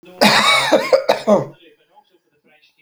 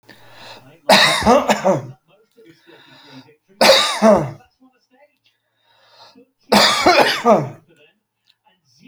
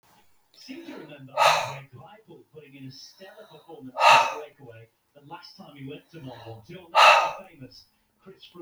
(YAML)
cough_length: 2.8 s
cough_amplitude: 32768
cough_signal_mean_std_ratio: 0.51
three_cough_length: 8.9 s
three_cough_amplitude: 30358
three_cough_signal_mean_std_ratio: 0.42
exhalation_length: 8.6 s
exhalation_amplitude: 24832
exhalation_signal_mean_std_ratio: 0.33
survey_phase: alpha (2021-03-01 to 2021-08-12)
age: 45-64
gender: Male
wearing_mask: 'No'
symptom_cough_any: true
symptom_shortness_of_breath: true
symptom_fatigue: true
symptom_headache: true
symptom_onset: 4 days
smoker_status: Never smoked
respiratory_condition_asthma: false
respiratory_condition_other: false
recruitment_source: Test and Trace
submission_delay: 1 day
covid_test_result: Positive
covid_test_method: RT-qPCR
covid_ct_value: 21.3
covid_ct_gene: ORF1ab gene
covid_ct_mean: 21.8
covid_viral_load: 69000 copies/ml
covid_viral_load_category: Low viral load (10K-1M copies/ml)